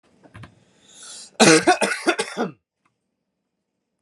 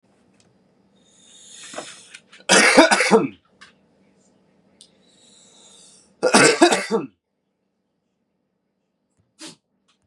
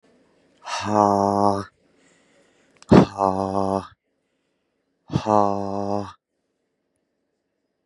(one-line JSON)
{"three_cough_length": "4.0 s", "three_cough_amplitude": 30225, "three_cough_signal_mean_std_ratio": 0.33, "cough_length": "10.1 s", "cough_amplitude": 32767, "cough_signal_mean_std_ratio": 0.3, "exhalation_length": "7.9 s", "exhalation_amplitude": 32075, "exhalation_signal_mean_std_ratio": 0.33, "survey_phase": "beta (2021-08-13 to 2022-03-07)", "age": "18-44", "gender": "Male", "wearing_mask": "No", "symptom_none": true, "smoker_status": "Current smoker (e-cigarettes or vapes only)", "respiratory_condition_asthma": false, "respiratory_condition_other": false, "recruitment_source": "Test and Trace", "submission_delay": "2 days", "covid_test_result": "Negative", "covid_test_method": "RT-qPCR"}